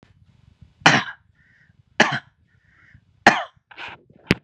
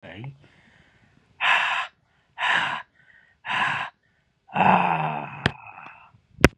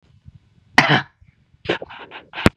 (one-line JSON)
{"three_cough_length": "4.4 s", "three_cough_amplitude": 32768, "three_cough_signal_mean_std_ratio": 0.25, "exhalation_length": "6.6 s", "exhalation_amplitude": 32768, "exhalation_signal_mean_std_ratio": 0.43, "cough_length": "2.6 s", "cough_amplitude": 32768, "cough_signal_mean_std_ratio": 0.3, "survey_phase": "beta (2021-08-13 to 2022-03-07)", "age": "45-64", "gender": "Male", "wearing_mask": "No", "symptom_none": true, "smoker_status": "Never smoked", "respiratory_condition_asthma": false, "respiratory_condition_other": false, "recruitment_source": "REACT", "submission_delay": "3 days", "covid_test_result": "Negative", "covid_test_method": "RT-qPCR", "influenza_a_test_result": "Negative", "influenza_b_test_result": "Negative"}